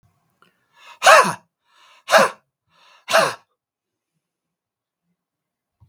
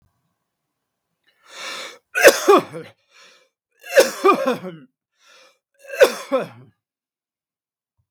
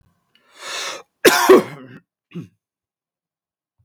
exhalation_length: 5.9 s
exhalation_amplitude: 32768
exhalation_signal_mean_std_ratio: 0.26
three_cough_length: 8.1 s
three_cough_amplitude: 32768
three_cough_signal_mean_std_ratio: 0.3
cough_length: 3.8 s
cough_amplitude: 32768
cough_signal_mean_std_ratio: 0.28
survey_phase: beta (2021-08-13 to 2022-03-07)
age: 65+
gender: Male
wearing_mask: 'No'
symptom_none: true
smoker_status: Never smoked
respiratory_condition_asthma: false
respiratory_condition_other: false
recruitment_source: REACT
submission_delay: 2 days
covid_test_result: Negative
covid_test_method: RT-qPCR
influenza_a_test_result: Negative
influenza_b_test_result: Negative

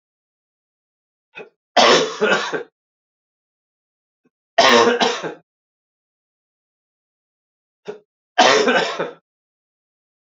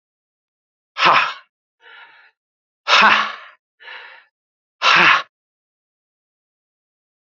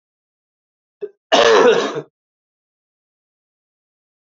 three_cough_length: 10.3 s
three_cough_amplitude: 29914
three_cough_signal_mean_std_ratio: 0.34
exhalation_length: 7.3 s
exhalation_amplitude: 32768
exhalation_signal_mean_std_ratio: 0.32
cough_length: 4.4 s
cough_amplitude: 28780
cough_signal_mean_std_ratio: 0.31
survey_phase: beta (2021-08-13 to 2022-03-07)
age: 45-64
gender: Male
wearing_mask: 'No'
symptom_new_continuous_cough: true
symptom_fatigue: true
smoker_status: Never smoked
respiratory_condition_asthma: false
respiratory_condition_other: false
recruitment_source: Test and Trace
submission_delay: 2 days
covid_test_result: Positive
covid_test_method: LFT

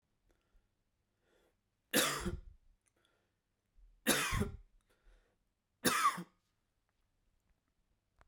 three_cough_length: 8.3 s
three_cough_amplitude: 4822
three_cough_signal_mean_std_ratio: 0.3
survey_phase: beta (2021-08-13 to 2022-03-07)
age: 18-44
gender: Male
wearing_mask: 'No'
symptom_runny_or_blocked_nose: true
symptom_fatigue: true
symptom_onset: 3 days
smoker_status: Ex-smoker
respiratory_condition_asthma: false
respiratory_condition_other: false
recruitment_source: Test and Trace
submission_delay: 2 days
covid_test_result: Positive
covid_test_method: ePCR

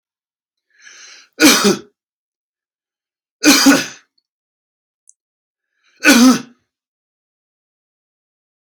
three_cough_length: 8.6 s
three_cough_amplitude: 32768
three_cough_signal_mean_std_ratio: 0.3
survey_phase: alpha (2021-03-01 to 2021-08-12)
age: 45-64
gender: Male
wearing_mask: 'No'
symptom_none: true
smoker_status: Ex-smoker
respiratory_condition_asthma: true
respiratory_condition_other: false
recruitment_source: REACT
submission_delay: 1 day
covid_test_result: Negative
covid_test_method: RT-qPCR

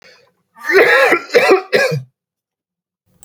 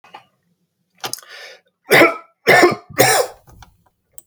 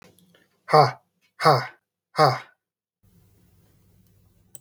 cough_length: 3.2 s
cough_amplitude: 32768
cough_signal_mean_std_ratio: 0.5
three_cough_length: 4.3 s
three_cough_amplitude: 32768
three_cough_signal_mean_std_ratio: 0.37
exhalation_length: 4.6 s
exhalation_amplitude: 23742
exhalation_signal_mean_std_ratio: 0.27
survey_phase: beta (2021-08-13 to 2022-03-07)
age: 18-44
gender: Male
wearing_mask: 'No'
symptom_runny_or_blocked_nose: true
symptom_onset: 7 days
smoker_status: Never smoked
respiratory_condition_asthma: false
respiratory_condition_other: false
recruitment_source: REACT
submission_delay: 1 day
covid_test_result: Negative
covid_test_method: RT-qPCR
influenza_a_test_result: Negative
influenza_b_test_result: Negative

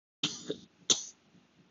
cough_length: 1.7 s
cough_amplitude: 9156
cough_signal_mean_std_ratio: 0.3
survey_phase: beta (2021-08-13 to 2022-03-07)
age: 18-44
gender: Male
wearing_mask: 'Yes'
symptom_none: true
smoker_status: Never smoked
respiratory_condition_asthma: false
respiratory_condition_other: false
recruitment_source: REACT
submission_delay: 2 days
covid_test_result: Negative
covid_test_method: RT-qPCR
influenza_a_test_result: Negative
influenza_b_test_result: Negative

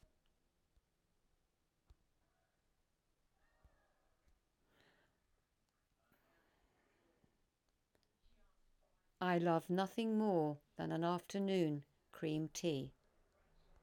exhalation_length: 13.8 s
exhalation_amplitude: 1981
exhalation_signal_mean_std_ratio: 0.35
survey_phase: alpha (2021-03-01 to 2021-08-12)
age: 65+
gender: Female
wearing_mask: 'No'
symptom_none: true
smoker_status: Ex-smoker
respiratory_condition_asthma: false
respiratory_condition_other: false
recruitment_source: REACT
submission_delay: 2 days
covid_test_result: Negative
covid_test_method: RT-qPCR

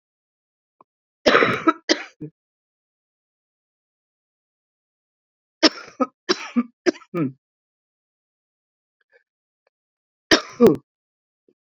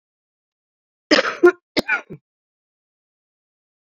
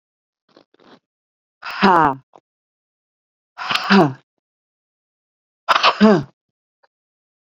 three_cough_length: 11.6 s
three_cough_amplitude: 30294
three_cough_signal_mean_std_ratio: 0.24
cough_length: 3.9 s
cough_amplitude: 32767
cough_signal_mean_std_ratio: 0.24
exhalation_length: 7.5 s
exhalation_amplitude: 29260
exhalation_signal_mean_std_ratio: 0.3
survey_phase: beta (2021-08-13 to 2022-03-07)
age: 45-64
gender: Female
wearing_mask: 'No'
symptom_new_continuous_cough: true
symptom_runny_or_blocked_nose: true
symptom_shortness_of_breath: true
symptom_sore_throat: true
symptom_abdominal_pain: true
symptom_fatigue: true
symptom_fever_high_temperature: true
symptom_headache: true
symptom_onset: 3 days
smoker_status: Ex-smoker
respiratory_condition_asthma: true
respiratory_condition_other: false
recruitment_source: Test and Trace
submission_delay: 1 day
covid_test_result: Positive
covid_test_method: ePCR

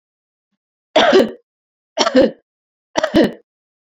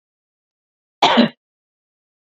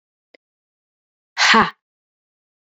three_cough_length: 3.8 s
three_cough_amplitude: 31843
three_cough_signal_mean_std_ratio: 0.39
cough_length: 2.3 s
cough_amplitude: 28902
cough_signal_mean_std_ratio: 0.26
exhalation_length: 2.6 s
exhalation_amplitude: 29013
exhalation_signal_mean_std_ratio: 0.26
survey_phase: beta (2021-08-13 to 2022-03-07)
age: 45-64
gender: Female
wearing_mask: 'No'
symptom_none: true
smoker_status: Never smoked
respiratory_condition_asthma: false
respiratory_condition_other: false
recruitment_source: REACT
submission_delay: 1 day
covid_test_result: Negative
covid_test_method: RT-qPCR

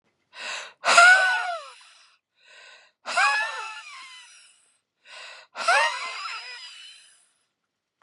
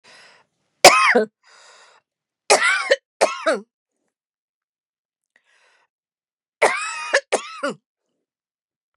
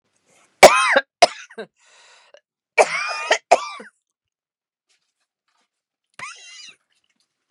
exhalation_length: 8.0 s
exhalation_amplitude: 29634
exhalation_signal_mean_std_ratio: 0.38
three_cough_length: 9.0 s
three_cough_amplitude: 32768
three_cough_signal_mean_std_ratio: 0.3
cough_length: 7.5 s
cough_amplitude: 32768
cough_signal_mean_std_ratio: 0.24
survey_phase: beta (2021-08-13 to 2022-03-07)
age: 45-64
gender: Female
wearing_mask: 'No'
symptom_cough_any: true
symptom_runny_or_blocked_nose: true
symptom_shortness_of_breath: true
symptom_sore_throat: true
symptom_fatigue: true
symptom_headache: true
symptom_onset: 2 days
smoker_status: Ex-smoker
respiratory_condition_asthma: false
respiratory_condition_other: false
recruitment_source: Test and Trace
submission_delay: 1 day
covid_test_result: Negative
covid_test_method: RT-qPCR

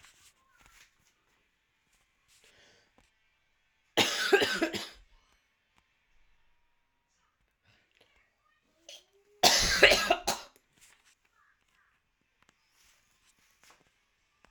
cough_length: 14.5 s
cough_amplitude: 21270
cough_signal_mean_std_ratio: 0.24
survey_phase: alpha (2021-03-01 to 2021-08-12)
age: 18-44
gender: Female
wearing_mask: 'No'
symptom_cough_any: true
symptom_new_continuous_cough: true
symptom_abdominal_pain: true
symptom_fatigue: true
symptom_fever_high_temperature: true
symptom_headache: true
smoker_status: Never smoked
respiratory_condition_asthma: false
respiratory_condition_other: false
recruitment_source: Test and Trace
submission_delay: 2 days
covid_test_result: Positive
covid_test_method: RT-qPCR
covid_ct_value: 29.2
covid_ct_gene: ORF1ab gene
covid_ct_mean: 30.0
covid_viral_load: 140 copies/ml
covid_viral_load_category: Minimal viral load (< 10K copies/ml)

